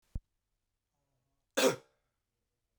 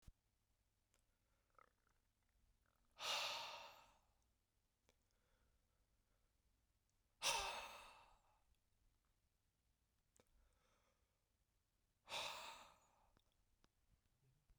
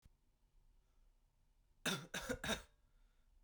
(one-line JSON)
{"cough_length": "2.8 s", "cough_amplitude": 6069, "cough_signal_mean_std_ratio": 0.21, "exhalation_length": "14.6 s", "exhalation_amplitude": 1236, "exhalation_signal_mean_std_ratio": 0.29, "three_cough_length": "3.4 s", "three_cough_amplitude": 1677, "three_cough_signal_mean_std_ratio": 0.36, "survey_phase": "beta (2021-08-13 to 2022-03-07)", "age": "18-44", "gender": "Male", "wearing_mask": "No", "symptom_cough_any": true, "smoker_status": "Never smoked", "respiratory_condition_asthma": true, "respiratory_condition_other": false, "recruitment_source": "Test and Trace", "submission_delay": "2 days", "covid_test_result": "Negative", "covid_test_method": "RT-qPCR"}